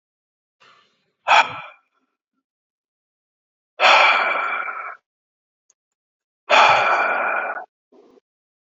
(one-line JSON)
{"exhalation_length": "8.6 s", "exhalation_amplitude": 27612, "exhalation_signal_mean_std_ratio": 0.39, "survey_phase": "alpha (2021-03-01 to 2021-08-12)", "age": "65+", "gender": "Male", "wearing_mask": "No", "symptom_none": true, "smoker_status": "Never smoked", "respiratory_condition_asthma": false, "respiratory_condition_other": false, "recruitment_source": "REACT", "submission_delay": "2 days", "covid_test_result": "Negative", "covid_test_method": "RT-qPCR"}